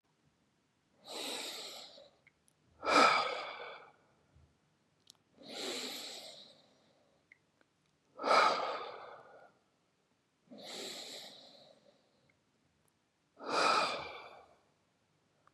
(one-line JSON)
{"exhalation_length": "15.5 s", "exhalation_amplitude": 7562, "exhalation_signal_mean_std_ratio": 0.34, "survey_phase": "beta (2021-08-13 to 2022-03-07)", "age": "45-64", "gender": "Male", "wearing_mask": "No", "symptom_none": true, "smoker_status": "Ex-smoker", "respiratory_condition_asthma": false, "respiratory_condition_other": true, "recruitment_source": "REACT", "submission_delay": "2 days", "covid_test_result": "Negative", "covid_test_method": "RT-qPCR", "influenza_a_test_result": "Negative", "influenza_b_test_result": "Negative"}